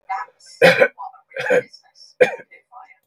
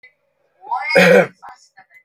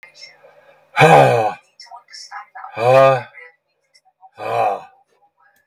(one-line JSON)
{"three_cough_length": "3.1 s", "three_cough_amplitude": 32768, "three_cough_signal_mean_std_ratio": 0.37, "cough_length": "2.0 s", "cough_amplitude": 32768, "cough_signal_mean_std_ratio": 0.41, "exhalation_length": "5.7 s", "exhalation_amplitude": 32768, "exhalation_signal_mean_std_ratio": 0.4, "survey_phase": "beta (2021-08-13 to 2022-03-07)", "age": "65+", "gender": "Male", "wearing_mask": "No", "symptom_abdominal_pain": true, "symptom_fatigue": true, "symptom_onset": "11 days", "smoker_status": "Never smoked", "respiratory_condition_asthma": false, "respiratory_condition_other": false, "recruitment_source": "REACT", "submission_delay": "5 days", "covid_test_result": "Negative", "covid_test_method": "RT-qPCR", "influenza_a_test_result": "Negative", "influenza_b_test_result": "Negative"}